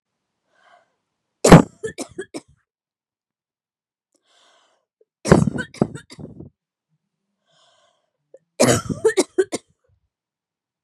{"three_cough_length": "10.8 s", "three_cough_amplitude": 32768, "three_cough_signal_mean_std_ratio": 0.21, "survey_phase": "beta (2021-08-13 to 2022-03-07)", "age": "45-64", "gender": "Female", "wearing_mask": "No", "symptom_none": true, "smoker_status": "Ex-smoker", "respiratory_condition_asthma": false, "respiratory_condition_other": false, "recruitment_source": "REACT", "submission_delay": "1 day", "covid_test_result": "Negative", "covid_test_method": "RT-qPCR", "influenza_a_test_result": "Negative", "influenza_b_test_result": "Negative"}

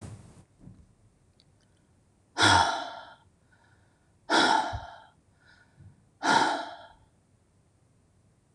{"exhalation_length": "8.5 s", "exhalation_amplitude": 12673, "exhalation_signal_mean_std_ratio": 0.34, "survey_phase": "beta (2021-08-13 to 2022-03-07)", "age": "45-64", "gender": "Male", "wearing_mask": "No", "symptom_cough_any": true, "symptom_runny_or_blocked_nose": true, "symptom_sore_throat": true, "symptom_fatigue": true, "symptom_onset": "10 days", "smoker_status": "Never smoked", "respiratory_condition_asthma": false, "respiratory_condition_other": false, "recruitment_source": "REACT", "submission_delay": "10 days", "covid_test_result": "Negative", "covid_test_method": "RT-qPCR", "influenza_a_test_result": "Negative", "influenza_b_test_result": "Negative"}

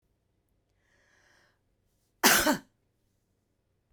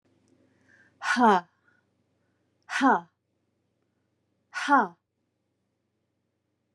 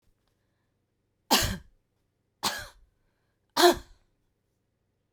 {"cough_length": "3.9 s", "cough_amplitude": 18349, "cough_signal_mean_std_ratio": 0.23, "exhalation_length": "6.7 s", "exhalation_amplitude": 13532, "exhalation_signal_mean_std_ratio": 0.28, "three_cough_length": "5.1 s", "three_cough_amplitude": 18280, "three_cough_signal_mean_std_ratio": 0.24, "survey_phase": "beta (2021-08-13 to 2022-03-07)", "age": "45-64", "gender": "Female", "wearing_mask": "No", "symptom_none": true, "smoker_status": "Never smoked", "respiratory_condition_asthma": false, "respiratory_condition_other": false, "recruitment_source": "REACT", "submission_delay": "2 days", "covid_test_result": "Negative", "covid_test_method": "RT-qPCR"}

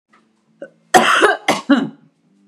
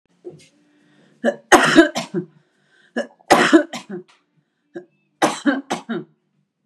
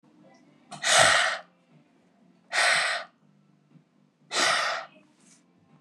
{"cough_length": "2.5 s", "cough_amplitude": 32768, "cough_signal_mean_std_ratio": 0.43, "three_cough_length": "6.7 s", "three_cough_amplitude": 32768, "three_cough_signal_mean_std_ratio": 0.35, "exhalation_length": "5.8 s", "exhalation_amplitude": 20971, "exhalation_signal_mean_std_ratio": 0.42, "survey_phase": "beta (2021-08-13 to 2022-03-07)", "age": "45-64", "gender": "Female", "wearing_mask": "No", "symptom_none": true, "smoker_status": "Never smoked", "respiratory_condition_asthma": false, "respiratory_condition_other": false, "recruitment_source": "REACT", "submission_delay": "3 days", "covid_test_result": "Negative", "covid_test_method": "RT-qPCR"}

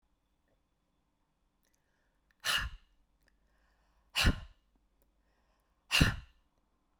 {"exhalation_length": "7.0 s", "exhalation_amplitude": 9424, "exhalation_signal_mean_std_ratio": 0.24, "survey_phase": "beta (2021-08-13 to 2022-03-07)", "age": "18-44", "gender": "Female", "wearing_mask": "No", "symptom_none": true, "smoker_status": "Never smoked", "respiratory_condition_asthma": false, "respiratory_condition_other": false, "recruitment_source": "REACT", "submission_delay": "1 day", "covid_test_result": "Negative", "covid_test_method": "RT-qPCR"}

